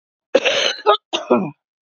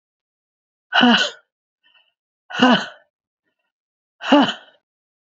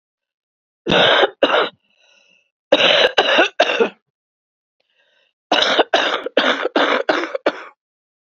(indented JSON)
{
  "cough_length": "2.0 s",
  "cough_amplitude": 28979,
  "cough_signal_mean_std_ratio": 0.5,
  "exhalation_length": "5.3 s",
  "exhalation_amplitude": 28286,
  "exhalation_signal_mean_std_ratio": 0.33,
  "three_cough_length": "8.4 s",
  "three_cough_amplitude": 29958,
  "three_cough_signal_mean_std_ratio": 0.5,
  "survey_phase": "beta (2021-08-13 to 2022-03-07)",
  "age": "45-64",
  "gender": "Female",
  "wearing_mask": "No",
  "symptom_cough_any": true,
  "symptom_new_continuous_cough": true,
  "symptom_runny_or_blocked_nose": true,
  "symptom_shortness_of_breath": true,
  "symptom_sore_throat": true,
  "symptom_abdominal_pain": true,
  "symptom_diarrhoea": true,
  "symptom_fatigue": true,
  "symptom_fever_high_temperature": true,
  "symptom_headache": true,
  "symptom_change_to_sense_of_smell_or_taste": true,
  "symptom_loss_of_taste": true,
  "symptom_onset": "4 days",
  "smoker_status": "Never smoked",
  "respiratory_condition_asthma": true,
  "respiratory_condition_other": false,
  "recruitment_source": "Test and Trace",
  "submission_delay": "2 days",
  "covid_test_result": "Positive",
  "covid_test_method": "RT-qPCR",
  "covid_ct_value": 13.8,
  "covid_ct_gene": "ORF1ab gene",
  "covid_ct_mean": 14.1,
  "covid_viral_load": "23000000 copies/ml",
  "covid_viral_load_category": "High viral load (>1M copies/ml)"
}